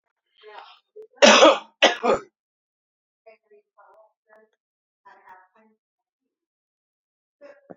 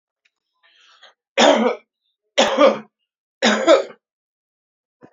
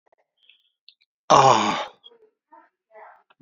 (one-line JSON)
{"cough_length": "7.8 s", "cough_amplitude": 30194, "cough_signal_mean_std_ratio": 0.22, "three_cough_length": "5.1 s", "three_cough_amplitude": 30188, "three_cough_signal_mean_std_ratio": 0.37, "exhalation_length": "3.4 s", "exhalation_amplitude": 27526, "exhalation_signal_mean_std_ratio": 0.29, "survey_phase": "alpha (2021-03-01 to 2021-08-12)", "age": "65+", "gender": "Male", "wearing_mask": "No", "symptom_none": true, "smoker_status": "Ex-smoker", "respiratory_condition_asthma": false, "respiratory_condition_other": false, "recruitment_source": "REACT", "submission_delay": "2 days", "covid_test_result": "Negative", "covid_test_method": "RT-qPCR"}